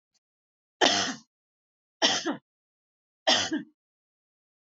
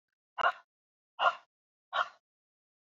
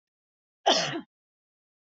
{
  "three_cough_length": "4.6 s",
  "three_cough_amplitude": 15094,
  "three_cough_signal_mean_std_ratio": 0.34,
  "exhalation_length": "2.9 s",
  "exhalation_amplitude": 7611,
  "exhalation_signal_mean_std_ratio": 0.27,
  "cough_length": "2.0 s",
  "cough_amplitude": 12400,
  "cough_signal_mean_std_ratio": 0.29,
  "survey_phase": "alpha (2021-03-01 to 2021-08-12)",
  "age": "45-64",
  "gender": "Female",
  "wearing_mask": "No",
  "symptom_none": true,
  "smoker_status": "Never smoked",
  "respiratory_condition_asthma": false,
  "respiratory_condition_other": false,
  "recruitment_source": "REACT",
  "submission_delay": "1 day",
  "covid_test_result": "Negative",
  "covid_test_method": "RT-qPCR"
}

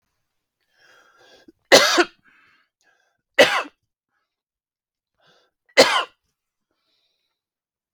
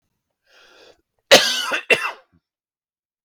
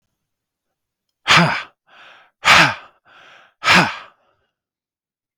{
  "three_cough_length": "7.9 s",
  "three_cough_amplitude": 32768,
  "three_cough_signal_mean_std_ratio": 0.23,
  "cough_length": "3.2 s",
  "cough_amplitude": 32768,
  "cough_signal_mean_std_ratio": 0.29,
  "exhalation_length": "5.4 s",
  "exhalation_amplitude": 32768,
  "exhalation_signal_mean_std_ratio": 0.32,
  "survey_phase": "beta (2021-08-13 to 2022-03-07)",
  "age": "45-64",
  "gender": "Male",
  "wearing_mask": "No",
  "symptom_none": true,
  "smoker_status": "Never smoked",
  "respiratory_condition_asthma": false,
  "respiratory_condition_other": false,
  "recruitment_source": "REACT",
  "submission_delay": "2 days",
  "covid_test_result": "Negative",
  "covid_test_method": "RT-qPCR",
  "influenza_a_test_result": "Negative",
  "influenza_b_test_result": "Negative"
}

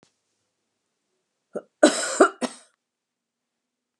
{
  "cough_length": "4.0 s",
  "cough_amplitude": 29030,
  "cough_signal_mean_std_ratio": 0.22,
  "survey_phase": "beta (2021-08-13 to 2022-03-07)",
  "age": "65+",
  "gender": "Female",
  "wearing_mask": "No",
  "symptom_none": true,
  "smoker_status": "Never smoked",
  "respiratory_condition_asthma": false,
  "respiratory_condition_other": false,
  "recruitment_source": "REACT",
  "submission_delay": "4 days",
  "covid_test_result": "Negative",
  "covid_test_method": "RT-qPCR",
  "influenza_a_test_result": "Negative",
  "influenza_b_test_result": "Negative"
}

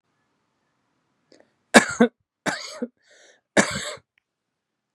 {
  "three_cough_length": "4.9 s",
  "three_cough_amplitude": 32768,
  "three_cough_signal_mean_std_ratio": 0.23,
  "survey_phase": "beta (2021-08-13 to 2022-03-07)",
  "age": "45-64",
  "gender": "Male",
  "wearing_mask": "No",
  "symptom_none": true,
  "smoker_status": "Ex-smoker",
  "respiratory_condition_asthma": true,
  "respiratory_condition_other": false,
  "recruitment_source": "REACT",
  "submission_delay": "2 days",
  "covid_test_result": "Negative",
  "covid_test_method": "RT-qPCR"
}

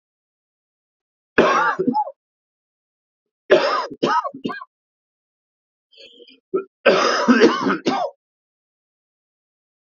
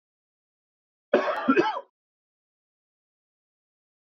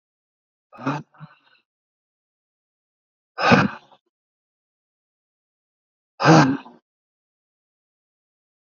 {
  "three_cough_length": "10.0 s",
  "three_cough_amplitude": 32768,
  "three_cough_signal_mean_std_ratio": 0.39,
  "cough_length": "4.1 s",
  "cough_amplitude": 13663,
  "cough_signal_mean_std_ratio": 0.28,
  "exhalation_length": "8.6 s",
  "exhalation_amplitude": 32185,
  "exhalation_signal_mean_std_ratio": 0.23,
  "survey_phase": "beta (2021-08-13 to 2022-03-07)",
  "age": "45-64",
  "gender": "Male",
  "wearing_mask": "No",
  "symptom_cough_any": true,
  "symptom_runny_or_blocked_nose": true,
  "symptom_sore_throat": true,
  "symptom_headache": true,
  "symptom_onset": "3 days",
  "smoker_status": "Never smoked",
  "respiratory_condition_asthma": true,
  "respiratory_condition_other": false,
  "recruitment_source": "Test and Trace",
  "submission_delay": "2 days",
  "covid_test_result": "Positive",
  "covid_test_method": "RT-qPCR",
  "covid_ct_value": 24.7,
  "covid_ct_gene": "ORF1ab gene"
}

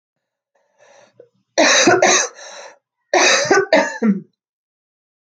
{
  "three_cough_length": "5.3 s",
  "three_cough_amplitude": 31270,
  "three_cough_signal_mean_std_ratio": 0.47,
  "survey_phase": "alpha (2021-03-01 to 2021-08-12)",
  "age": "18-44",
  "gender": "Female",
  "wearing_mask": "No",
  "symptom_cough_any": true,
  "symptom_diarrhoea": true,
  "symptom_fever_high_temperature": true,
  "symptom_loss_of_taste": true,
  "symptom_onset": "5 days",
  "smoker_status": "Never smoked",
  "respiratory_condition_asthma": false,
  "respiratory_condition_other": false,
  "recruitment_source": "Test and Trace",
  "submission_delay": "1 day",
  "covid_test_result": "Positive",
  "covid_test_method": "RT-qPCR",
  "covid_ct_value": 18.6,
  "covid_ct_gene": "ORF1ab gene"
}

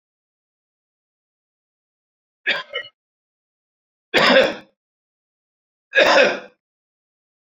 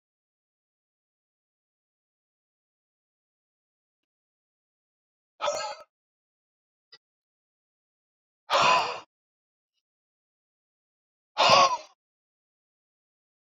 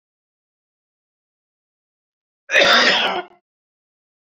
{
  "three_cough_length": "7.4 s",
  "three_cough_amplitude": 27956,
  "three_cough_signal_mean_std_ratio": 0.29,
  "exhalation_length": "13.6 s",
  "exhalation_amplitude": 18062,
  "exhalation_signal_mean_std_ratio": 0.21,
  "cough_length": "4.4 s",
  "cough_amplitude": 29217,
  "cough_signal_mean_std_ratio": 0.31,
  "survey_phase": "beta (2021-08-13 to 2022-03-07)",
  "age": "45-64",
  "gender": "Male",
  "wearing_mask": "No",
  "symptom_none": true,
  "smoker_status": "Ex-smoker",
  "respiratory_condition_asthma": false,
  "respiratory_condition_other": false,
  "recruitment_source": "REACT",
  "submission_delay": "2 days",
  "covid_test_result": "Negative",
  "covid_test_method": "RT-qPCR"
}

